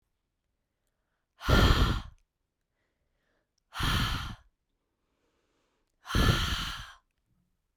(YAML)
exhalation_length: 7.8 s
exhalation_amplitude: 10688
exhalation_signal_mean_std_ratio: 0.36
survey_phase: beta (2021-08-13 to 2022-03-07)
age: 18-44
gender: Female
wearing_mask: 'No'
symptom_none: true
smoker_status: Never smoked
respiratory_condition_asthma: false
respiratory_condition_other: false
recruitment_source: REACT
submission_delay: 1 day
covid_test_result: Negative
covid_test_method: RT-qPCR
influenza_a_test_result: Negative
influenza_b_test_result: Negative